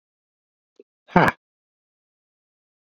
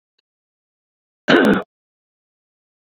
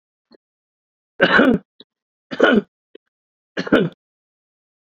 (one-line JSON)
{"exhalation_length": "2.9 s", "exhalation_amplitude": 27366, "exhalation_signal_mean_std_ratio": 0.17, "cough_length": "3.0 s", "cough_amplitude": 28016, "cough_signal_mean_std_ratio": 0.26, "three_cough_length": "4.9 s", "three_cough_amplitude": 28784, "three_cough_signal_mean_std_ratio": 0.32, "survey_phase": "beta (2021-08-13 to 2022-03-07)", "age": "65+", "gender": "Male", "wearing_mask": "No", "symptom_none": true, "smoker_status": "Never smoked", "respiratory_condition_asthma": true, "respiratory_condition_other": false, "recruitment_source": "REACT", "submission_delay": "14 days", "covid_test_result": "Negative", "covid_test_method": "RT-qPCR"}